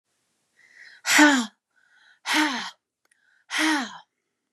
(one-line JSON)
{"exhalation_length": "4.5 s", "exhalation_amplitude": 25207, "exhalation_signal_mean_std_ratio": 0.38, "survey_phase": "beta (2021-08-13 to 2022-03-07)", "age": "18-44", "gender": "Female", "wearing_mask": "No", "symptom_cough_any": true, "symptom_runny_or_blocked_nose": true, "symptom_sore_throat": true, "symptom_fatigue": true, "symptom_headache": true, "smoker_status": "Never smoked", "respiratory_condition_asthma": true, "respiratory_condition_other": false, "recruitment_source": "Test and Trace", "submission_delay": "2 days", "covid_test_result": "Positive", "covid_test_method": "RT-qPCR", "covid_ct_value": 31.0, "covid_ct_gene": "ORF1ab gene"}